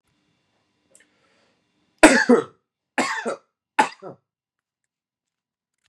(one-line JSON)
{"three_cough_length": "5.9 s", "three_cough_amplitude": 32768, "three_cough_signal_mean_std_ratio": 0.24, "survey_phase": "beta (2021-08-13 to 2022-03-07)", "age": "18-44", "gender": "Male", "wearing_mask": "No", "symptom_none": true, "smoker_status": "Ex-smoker", "respiratory_condition_asthma": false, "respiratory_condition_other": false, "recruitment_source": "Test and Trace", "submission_delay": "2 days", "covid_test_result": "Positive", "covid_test_method": "RT-qPCR", "covid_ct_value": 22.6, "covid_ct_gene": "ORF1ab gene", "covid_ct_mean": 22.7, "covid_viral_load": "36000 copies/ml", "covid_viral_load_category": "Low viral load (10K-1M copies/ml)"}